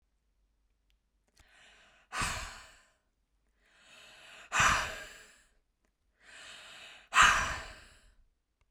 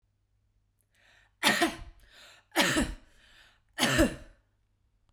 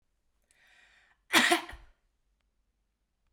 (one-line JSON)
{"exhalation_length": "8.7 s", "exhalation_amplitude": 11302, "exhalation_signal_mean_std_ratio": 0.29, "three_cough_length": "5.1 s", "three_cough_amplitude": 14228, "three_cough_signal_mean_std_ratio": 0.37, "cough_length": "3.3 s", "cough_amplitude": 12949, "cough_signal_mean_std_ratio": 0.24, "survey_phase": "beta (2021-08-13 to 2022-03-07)", "age": "18-44", "gender": "Female", "wearing_mask": "No", "symptom_none": true, "smoker_status": "Never smoked", "respiratory_condition_asthma": false, "respiratory_condition_other": false, "recruitment_source": "REACT", "submission_delay": "1 day", "covid_test_result": "Negative", "covid_test_method": "RT-qPCR", "influenza_a_test_result": "Unknown/Void", "influenza_b_test_result": "Unknown/Void"}